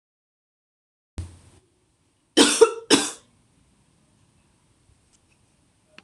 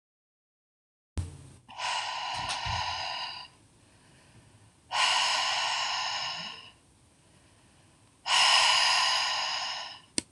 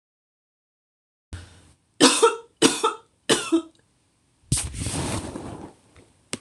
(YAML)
cough_length: 6.0 s
cough_amplitude: 26028
cough_signal_mean_std_ratio: 0.22
exhalation_length: 10.3 s
exhalation_amplitude: 14755
exhalation_signal_mean_std_ratio: 0.58
three_cough_length: 6.4 s
three_cough_amplitude: 26028
three_cough_signal_mean_std_ratio: 0.37
survey_phase: beta (2021-08-13 to 2022-03-07)
age: 18-44
gender: Female
wearing_mask: 'No'
symptom_cough_any: true
symptom_shortness_of_breath: true
symptom_sore_throat: true
symptom_onset: 3 days
smoker_status: Ex-smoker
respiratory_condition_asthma: false
respiratory_condition_other: false
recruitment_source: Test and Trace
submission_delay: 2 days
covid_test_result: Positive
covid_test_method: RT-qPCR
covid_ct_value: 37.7
covid_ct_gene: N gene